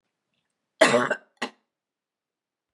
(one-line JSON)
{"cough_length": "2.7 s", "cough_amplitude": 20010, "cough_signal_mean_std_ratio": 0.26, "survey_phase": "beta (2021-08-13 to 2022-03-07)", "age": "65+", "gender": "Female", "wearing_mask": "No", "symptom_none": true, "symptom_onset": "3 days", "smoker_status": "Never smoked", "respiratory_condition_asthma": false, "respiratory_condition_other": false, "recruitment_source": "REACT", "submission_delay": "3 days", "covid_test_result": "Negative", "covid_test_method": "RT-qPCR", "influenza_a_test_result": "Negative", "influenza_b_test_result": "Negative"}